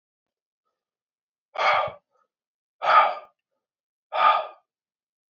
{"exhalation_length": "5.3 s", "exhalation_amplitude": 18930, "exhalation_signal_mean_std_ratio": 0.33, "survey_phase": "beta (2021-08-13 to 2022-03-07)", "age": "18-44", "gender": "Male", "wearing_mask": "No", "symptom_cough_any": true, "symptom_runny_or_blocked_nose": true, "symptom_sore_throat": true, "symptom_fatigue": true, "symptom_headache": true, "smoker_status": "Never smoked", "respiratory_condition_asthma": false, "respiratory_condition_other": false, "recruitment_source": "Test and Trace", "submission_delay": "3 days", "covid_test_result": "Positive", "covid_test_method": "LFT"}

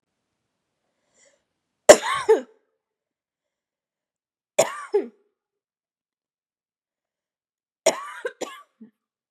{"three_cough_length": "9.3 s", "three_cough_amplitude": 32768, "three_cough_signal_mean_std_ratio": 0.18, "survey_phase": "beta (2021-08-13 to 2022-03-07)", "age": "18-44", "gender": "Female", "wearing_mask": "No", "symptom_change_to_sense_of_smell_or_taste": true, "symptom_onset": "11 days", "smoker_status": "Never smoked", "respiratory_condition_asthma": false, "respiratory_condition_other": false, "recruitment_source": "REACT", "submission_delay": "1 day", "covid_test_result": "Negative", "covid_test_method": "RT-qPCR", "covid_ct_value": 39.0, "covid_ct_gene": "N gene", "influenza_a_test_result": "Negative", "influenza_b_test_result": "Negative"}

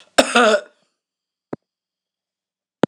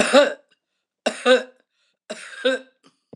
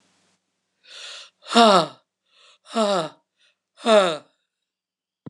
{"cough_length": "2.9 s", "cough_amplitude": 26028, "cough_signal_mean_std_ratio": 0.29, "three_cough_length": "3.2 s", "three_cough_amplitude": 25875, "three_cough_signal_mean_std_ratio": 0.38, "exhalation_length": "5.3 s", "exhalation_amplitude": 25404, "exhalation_signal_mean_std_ratio": 0.33, "survey_phase": "beta (2021-08-13 to 2022-03-07)", "age": "65+", "gender": "Female", "wearing_mask": "No", "symptom_none": true, "smoker_status": "Ex-smoker", "respiratory_condition_asthma": true, "respiratory_condition_other": false, "recruitment_source": "REACT", "submission_delay": "2 days", "covid_test_result": "Negative", "covid_test_method": "RT-qPCR"}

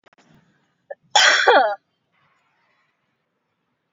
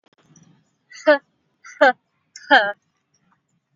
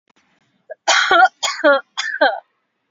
{"cough_length": "3.9 s", "cough_amplitude": 28214, "cough_signal_mean_std_ratio": 0.31, "exhalation_length": "3.8 s", "exhalation_amplitude": 27395, "exhalation_signal_mean_std_ratio": 0.26, "three_cough_length": "2.9 s", "three_cough_amplitude": 29376, "three_cough_signal_mean_std_ratio": 0.47, "survey_phase": "beta (2021-08-13 to 2022-03-07)", "age": "18-44", "gender": "Female", "wearing_mask": "No", "symptom_cough_any": true, "smoker_status": "Never smoked", "respiratory_condition_asthma": true, "respiratory_condition_other": false, "recruitment_source": "REACT", "submission_delay": "6 days", "covid_test_result": "Negative", "covid_test_method": "RT-qPCR", "influenza_a_test_result": "Negative", "influenza_b_test_result": "Negative"}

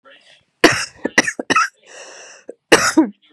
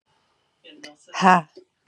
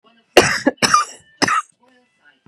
{"cough_length": "3.3 s", "cough_amplitude": 32768, "cough_signal_mean_std_ratio": 0.38, "exhalation_length": "1.9 s", "exhalation_amplitude": 31255, "exhalation_signal_mean_std_ratio": 0.26, "three_cough_length": "2.5 s", "three_cough_amplitude": 32768, "three_cough_signal_mean_std_ratio": 0.4, "survey_phase": "beta (2021-08-13 to 2022-03-07)", "age": "45-64", "gender": "Female", "wearing_mask": "No", "symptom_cough_any": true, "symptom_runny_or_blocked_nose": true, "symptom_shortness_of_breath": true, "symptom_sore_throat": true, "symptom_abdominal_pain": true, "symptom_diarrhoea": true, "symptom_fatigue": true, "symptom_fever_high_temperature": true, "symptom_headache": true, "symptom_onset": "5 days", "smoker_status": "Ex-smoker", "respiratory_condition_asthma": false, "respiratory_condition_other": false, "recruitment_source": "Test and Trace", "submission_delay": "2 days", "covid_test_result": "Positive", "covid_test_method": "RT-qPCR"}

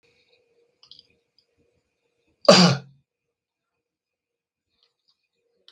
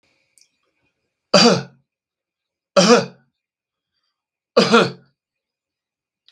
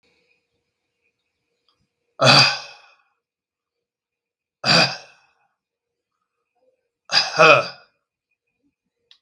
{"cough_length": "5.7 s", "cough_amplitude": 32768, "cough_signal_mean_std_ratio": 0.17, "three_cough_length": "6.3 s", "three_cough_amplitude": 32768, "three_cough_signal_mean_std_ratio": 0.29, "exhalation_length": "9.2 s", "exhalation_amplitude": 32767, "exhalation_signal_mean_std_ratio": 0.26, "survey_phase": "beta (2021-08-13 to 2022-03-07)", "age": "65+", "gender": "Male", "wearing_mask": "No", "symptom_none": true, "smoker_status": "Ex-smoker", "respiratory_condition_asthma": false, "respiratory_condition_other": false, "recruitment_source": "REACT", "submission_delay": "2 days", "covid_test_result": "Negative", "covid_test_method": "RT-qPCR", "influenza_a_test_result": "Negative", "influenza_b_test_result": "Negative"}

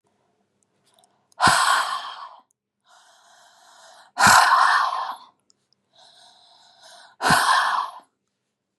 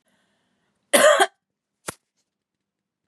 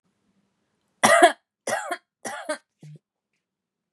{"exhalation_length": "8.8 s", "exhalation_amplitude": 30676, "exhalation_signal_mean_std_ratio": 0.41, "cough_length": "3.1 s", "cough_amplitude": 28085, "cough_signal_mean_std_ratio": 0.26, "three_cough_length": "3.9 s", "three_cough_amplitude": 31116, "three_cough_signal_mean_std_ratio": 0.28, "survey_phase": "beta (2021-08-13 to 2022-03-07)", "age": "18-44", "gender": "Female", "wearing_mask": "No", "symptom_cough_any": true, "symptom_shortness_of_breath": true, "symptom_diarrhoea": true, "symptom_fatigue": true, "symptom_fever_high_temperature": true, "symptom_headache": true, "smoker_status": "Never smoked", "respiratory_condition_asthma": true, "respiratory_condition_other": false, "recruitment_source": "Test and Trace", "submission_delay": "2 days", "covid_test_result": "Positive", "covid_test_method": "ePCR"}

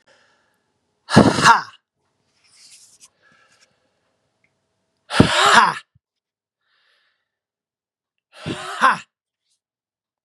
{"exhalation_length": "10.2 s", "exhalation_amplitude": 32768, "exhalation_signal_mean_std_ratio": 0.27, "survey_phase": "beta (2021-08-13 to 2022-03-07)", "age": "45-64", "gender": "Male", "wearing_mask": "No", "symptom_cough_any": true, "symptom_runny_or_blocked_nose": true, "symptom_sore_throat": true, "symptom_abdominal_pain": true, "symptom_fatigue": true, "symptom_change_to_sense_of_smell_or_taste": true, "smoker_status": "Never smoked", "respiratory_condition_asthma": true, "respiratory_condition_other": false, "recruitment_source": "Test and Trace", "submission_delay": "2 days", "covid_test_result": "Positive", "covid_test_method": "LFT"}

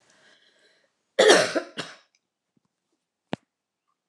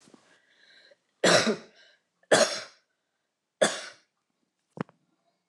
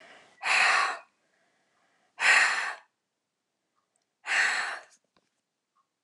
{"cough_length": "4.1 s", "cough_amplitude": 27215, "cough_signal_mean_std_ratio": 0.25, "three_cough_length": "5.5 s", "three_cough_amplitude": 15318, "three_cough_signal_mean_std_ratio": 0.28, "exhalation_length": "6.0 s", "exhalation_amplitude": 11441, "exhalation_signal_mean_std_ratio": 0.4, "survey_phase": "alpha (2021-03-01 to 2021-08-12)", "age": "65+", "gender": "Female", "wearing_mask": "No", "symptom_none": true, "smoker_status": "Never smoked", "respiratory_condition_asthma": false, "respiratory_condition_other": false, "recruitment_source": "REACT", "submission_delay": "4 days", "covid_test_result": "Negative", "covid_test_method": "RT-qPCR"}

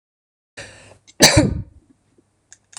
{"cough_length": "2.8 s", "cough_amplitude": 26028, "cough_signal_mean_std_ratio": 0.28, "survey_phase": "beta (2021-08-13 to 2022-03-07)", "age": "45-64", "gender": "Female", "wearing_mask": "No", "symptom_none": true, "smoker_status": "Ex-smoker", "respiratory_condition_asthma": false, "respiratory_condition_other": false, "recruitment_source": "REACT", "submission_delay": "3 days", "covid_test_result": "Negative", "covid_test_method": "RT-qPCR", "influenza_a_test_result": "Unknown/Void", "influenza_b_test_result": "Unknown/Void"}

